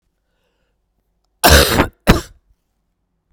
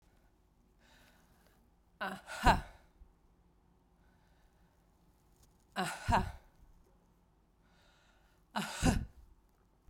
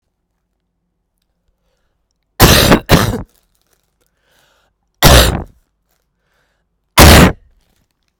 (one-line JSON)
{"cough_length": "3.3 s", "cough_amplitude": 32768, "cough_signal_mean_std_ratio": 0.31, "exhalation_length": "9.9 s", "exhalation_amplitude": 8246, "exhalation_signal_mean_std_ratio": 0.27, "three_cough_length": "8.2 s", "three_cough_amplitude": 32768, "three_cough_signal_mean_std_ratio": 0.33, "survey_phase": "beta (2021-08-13 to 2022-03-07)", "age": "45-64", "gender": "Female", "wearing_mask": "No", "symptom_cough_any": true, "symptom_new_continuous_cough": true, "symptom_runny_or_blocked_nose": true, "symptom_shortness_of_breath": true, "symptom_fatigue": true, "symptom_headache": true, "symptom_change_to_sense_of_smell_or_taste": true, "symptom_onset": "4 days", "smoker_status": "Never smoked", "respiratory_condition_asthma": true, "respiratory_condition_other": false, "recruitment_source": "Test and Trace", "submission_delay": "1 day", "covid_test_result": "Positive", "covid_test_method": "RT-qPCR", "covid_ct_value": 27.3, "covid_ct_gene": "ORF1ab gene", "covid_ct_mean": 27.7, "covid_viral_load": "800 copies/ml", "covid_viral_load_category": "Minimal viral load (< 10K copies/ml)"}